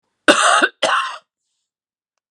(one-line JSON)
{"cough_length": "2.3 s", "cough_amplitude": 32768, "cough_signal_mean_std_ratio": 0.42, "survey_phase": "beta (2021-08-13 to 2022-03-07)", "age": "65+", "gender": "Female", "wearing_mask": "No", "symptom_cough_any": true, "symptom_headache": true, "symptom_onset": "12 days", "smoker_status": "Never smoked", "respiratory_condition_asthma": false, "respiratory_condition_other": false, "recruitment_source": "REACT", "submission_delay": "2 days", "covid_test_result": "Negative", "covid_test_method": "RT-qPCR", "influenza_a_test_result": "Negative", "influenza_b_test_result": "Negative"}